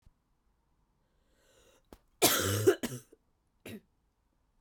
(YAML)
cough_length: 4.6 s
cough_amplitude: 12042
cough_signal_mean_std_ratio: 0.29
survey_phase: beta (2021-08-13 to 2022-03-07)
age: 18-44
gender: Female
wearing_mask: 'No'
symptom_cough_any: true
symptom_new_continuous_cough: true
symptom_runny_or_blocked_nose: true
symptom_shortness_of_breath: true
symptom_sore_throat: true
symptom_fatigue: true
symptom_fever_high_temperature: true
symptom_headache: true
symptom_change_to_sense_of_smell_or_taste: true
symptom_loss_of_taste: true
symptom_onset: 4 days
smoker_status: Ex-smoker
respiratory_condition_asthma: false
respiratory_condition_other: false
recruitment_source: Test and Trace
submission_delay: 1 day
covid_test_result: Positive
covid_test_method: RT-qPCR
covid_ct_value: 19.0
covid_ct_gene: ORF1ab gene